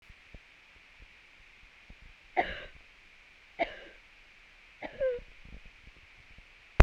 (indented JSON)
{
  "three_cough_length": "6.8 s",
  "three_cough_amplitude": 32767,
  "three_cough_signal_mean_std_ratio": 0.22,
  "survey_phase": "beta (2021-08-13 to 2022-03-07)",
  "age": "45-64",
  "gender": "Female",
  "wearing_mask": "No",
  "symptom_none": true,
  "smoker_status": "Never smoked",
  "respiratory_condition_asthma": false,
  "respiratory_condition_other": false,
  "recruitment_source": "REACT",
  "submission_delay": "2 days",
  "covid_test_result": "Negative",
  "covid_test_method": "RT-qPCR"
}